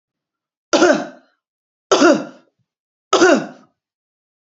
three_cough_length: 4.5 s
three_cough_amplitude: 32767
three_cough_signal_mean_std_ratio: 0.36
survey_phase: beta (2021-08-13 to 2022-03-07)
age: 45-64
gender: Female
wearing_mask: 'No'
symptom_none: true
smoker_status: Ex-smoker
respiratory_condition_asthma: false
respiratory_condition_other: false
recruitment_source: REACT
submission_delay: 1 day
covid_test_result: Negative
covid_test_method: RT-qPCR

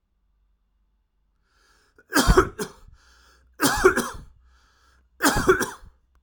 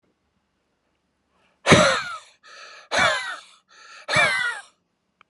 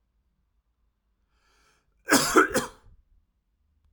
three_cough_length: 6.2 s
three_cough_amplitude: 27473
three_cough_signal_mean_std_ratio: 0.34
exhalation_length: 5.3 s
exhalation_amplitude: 30828
exhalation_signal_mean_std_ratio: 0.38
cough_length: 3.9 s
cough_amplitude: 18039
cough_signal_mean_std_ratio: 0.26
survey_phase: alpha (2021-03-01 to 2021-08-12)
age: 18-44
gender: Male
wearing_mask: 'No'
symptom_none: true
smoker_status: Ex-smoker
respiratory_condition_asthma: false
respiratory_condition_other: false
recruitment_source: REACT
submission_delay: 1 day
covid_test_result: Negative
covid_test_method: RT-qPCR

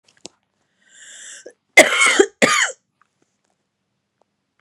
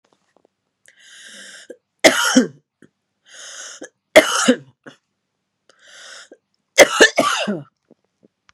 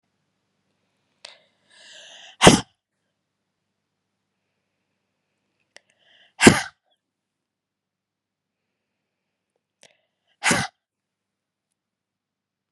cough_length: 4.6 s
cough_amplitude: 32768
cough_signal_mean_std_ratio: 0.3
three_cough_length: 8.5 s
three_cough_amplitude: 32768
three_cough_signal_mean_std_ratio: 0.29
exhalation_length: 12.7 s
exhalation_amplitude: 32768
exhalation_signal_mean_std_ratio: 0.15
survey_phase: beta (2021-08-13 to 2022-03-07)
age: 18-44
gender: Female
wearing_mask: 'No'
symptom_runny_or_blocked_nose: true
symptom_diarrhoea: true
symptom_fatigue: true
symptom_fever_high_temperature: true
symptom_headache: true
symptom_change_to_sense_of_smell_or_taste: true
symptom_onset: 3 days
smoker_status: Never smoked
respiratory_condition_asthma: false
respiratory_condition_other: false
recruitment_source: Test and Trace
submission_delay: 1 day
covid_test_result: Positive
covid_test_method: RT-qPCR
covid_ct_value: 24.6
covid_ct_gene: ORF1ab gene
covid_ct_mean: 25.1
covid_viral_load: 5700 copies/ml
covid_viral_load_category: Minimal viral load (< 10K copies/ml)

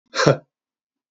exhalation_length: 1.1 s
exhalation_amplitude: 32768
exhalation_signal_mean_std_ratio: 0.31
survey_phase: beta (2021-08-13 to 2022-03-07)
age: 45-64
gender: Male
wearing_mask: 'No'
symptom_cough_any: true
symptom_runny_or_blocked_nose: true
symptom_sore_throat: true
symptom_fatigue: true
symptom_other: true
smoker_status: Never smoked
respiratory_condition_asthma: false
respiratory_condition_other: false
recruitment_source: Test and Trace
submission_delay: 1 day
covid_test_result: Positive
covid_test_method: RT-qPCR
covid_ct_value: 20.3
covid_ct_gene: ORF1ab gene
covid_ct_mean: 20.8
covid_viral_load: 150000 copies/ml
covid_viral_load_category: Low viral load (10K-1M copies/ml)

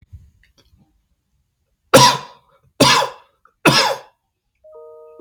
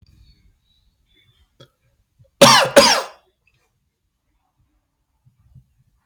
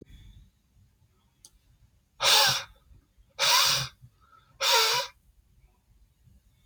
three_cough_length: 5.2 s
three_cough_amplitude: 32768
three_cough_signal_mean_std_ratio: 0.32
cough_length: 6.1 s
cough_amplitude: 32768
cough_signal_mean_std_ratio: 0.23
exhalation_length: 6.7 s
exhalation_amplitude: 13660
exhalation_signal_mean_std_ratio: 0.38
survey_phase: beta (2021-08-13 to 2022-03-07)
age: 18-44
gender: Male
wearing_mask: 'No'
symptom_none: true
smoker_status: Never smoked
respiratory_condition_asthma: false
respiratory_condition_other: false
recruitment_source: REACT
submission_delay: 1 day
covid_test_result: Negative
covid_test_method: RT-qPCR
influenza_a_test_result: Negative
influenza_b_test_result: Negative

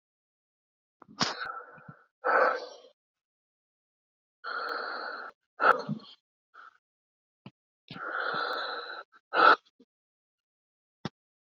exhalation_length: 11.5 s
exhalation_amplitude: 15054
exhalation_signal_mean_std_ratio: 0.33
survey_phase: beta (2021-08-13 to 2022-03-07)
age: 45-64
gender: Male
wearing_mask: 'No'
symptom_cough_any: true
symptom_new_continuous_cough: true
symptom_runny_or_blocked_nose: true
symptom_sore_throat: true
symptom_fatigue: true
symptom_headache: true
symptom_change_to_sense_of_smell_or_taste: true
symptom_loss_of_taste: true
symptom_other: true
smoker_status: Ex-smoker
respiratory_condition_asthma: false
respiratory_condition_other: true
recruitment_source: Test and Trace
submission_delay: 0 days
covid_test_result: Positive
covid_test_method: LFT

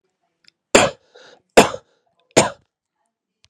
three_cough_length: 3.5 s
three_cough_amplitude: 32768
three_cough_signal_mean_std_ratio: 0.24
survey_phase: beta (2021-08-13 to 2022-03-07)
age: 18-44
gender: Male
wearing_mask: 'No'
symptom_cough_any: true
symptom_runny_or_blocked_nose: true
symptom_sore_throat: true
symptom_fatigue: true
symptom_onset: 2 days
smoker_status: Never smoked
respiratory_condition_asthma: false
respiratory_condition_other: false
recruitment_source: Test and Trace
submission_delay: 1 day
covid_test_result: Positive
covid_test_method: ePCR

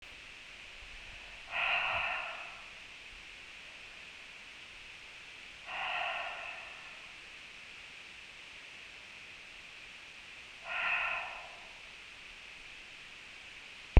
exhalation_length: 14.0 s
exhalation_amplitude: 16922
exhalation_signal_mean_std_ratio: 0.45
survey_phase: beta (2021-08-13 to 2022-03-07)
age: 45-64
gender: Female
wearing_mask: 'No'
symptom_runny_or_blocked_nose: true
symptom_fatigue: true
symptom_headache: true
symptom_change_to_sense_of_smell_or_taste: true
symptom_loss_of_taste: true
symptom_other: true
symptom_onset: 4 days
smoker_status: Current smoker (1 to 10 cigarettes per day)
respiratory_condition_asthma: true
respiratory_condition_other: false
recruitment_source: Test and Trace
submission_delay: 1 day
covid_test_result: Positive
covid_test_method: RT-qPCR
covid_ct_value: 18.4
covid_ct_gene: ORF1ab gene
covid_ct_mean: 19.1
covid_viral_load: 540000 copies/ml
covid_viral_load_category: Low viral load (10K-1M copies/ml)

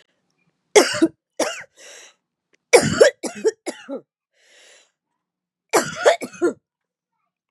three_cough_length: 7.5 s
three_cough_amplitude: 32768
three_cough_signal_mean_std_ratio: 0.31
survey_phase: beta (2021-08-13 to 2022-03-07)
age: 18-44
gender: Female
wearing_mask: 'No'
symptom_cough_any: true
symptom_runny_or_blocked_nose: true
symptom_shortness_of_breath: true
symptom_change_to_sense_of_smell_or_taste: true
symptom_loss_of_taste: true
symptom_onset: 2 days
smoker_status: Ex-smoker
respiratory_condition_asthma: false
respiratory_condition_other: false
recruitment_source: Test and Trace
submission_delay: 1 day
covid_test_result: Positive
covid_test_method: RT-qPCR
covid_ct_value: 21.0
covid_ct_gene: N gene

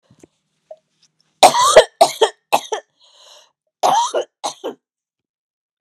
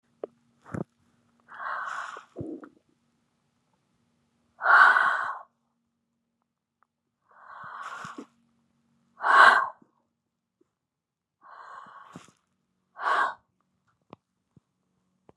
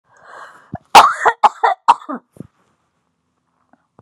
three_cough_length: 5.8 s
three_cough_amplitude: 32768
three_cough_signal_mean_std_ratio: 0.32
exhalation_length: 15.4 s
exhalation_amplitude: 25445
exhalation_signal_mean_std_ratio: 0.26
cough_length: 4.0 s
cough_amplitude: 32768
cough_signal_mean_std_ratio: 0.29
survey_phase: beta (2021-08-13 to 2022-03-07)
age: 45-64
gender: Female
wearing_mask: 'No'
symptom_cough_any: true
symptom_runny_or_blocked_nose: true
symptom_sore_throat: true
symptom_fatigue: true
symptom_onset: 3 days
smoker_status: Never smoked
respiratory_condition_asthma: true
respiratory_condition_other: false
recruitment_source: Test and Trace
submission_delay: 2 days
covid_test_result: Positive
covid_test_method: RT-qPCR
covid_ct_value: 19.3
covid_ct_gene: N gene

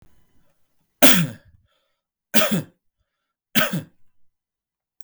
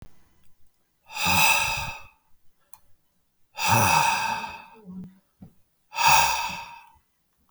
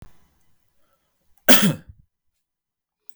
three_cough_length: 5.0 s
three_cough_amplitude: 32768
three_cough_signal_mean_std_ratio: 0.28
exhalation_length: 7.5 s
exhalation_amplitude: 22685
exhalation_signal_mean_std_ratio: 0.46
cough_length: 3.2 s
cough_amplitude: 32768
cough_signal_mean_std_ratio: 0.22
survey_phase: beta (2021-08-13 to 2022-03-07)
age: 45-64
gender: Male
wearing_mask: 'No'
symptom_cough_any: true
symptom_change_to_sense_of_smell_or_taste: true
smoker_status: Ex-smoker
respiratory_condition_asthma: false
respiratory_condition_other: false
recruitment_source: Test and Trace
submission_delay: 1 day
covid_test_result: Positive
covid_test_method: RT-qPCR
covid_ct_value: 23.2
covid_ct_gene: N gene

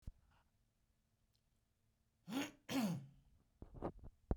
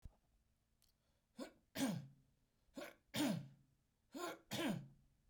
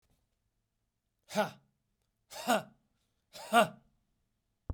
cough_length: 4.4 s
cough_amplitude: 2627
cough_signal_mean_std_ratio: 0.36
three_cough_length: 5.3 s
three_cough_amplitude: 1285
three_cough_signal_mean_std_ratio: 0.42
exhalation_length: 4.7 s
exhalation_amplitude: 9497
exhalation_signal_mean_std_ratio: 0.25
survey_phase: beta (2021-08-13 to 2022-03-07)
age: 18-44
gender: Male
wearing_mask: 'No'
symptom_change_to_sense_of_smell_or_taste: true
symptom_onset: 3 days
smoker_status: Never smoked
respiratory_condition_asthma: false
respiratory_condition_other: false
recruitment_source: Test and Trace
submission_delay: 2 days
covid_test_result: Positive
covid_test_method: RT-qPCR
covid_ct_value: 16.1
covid_ct_gene: ORF1ab gene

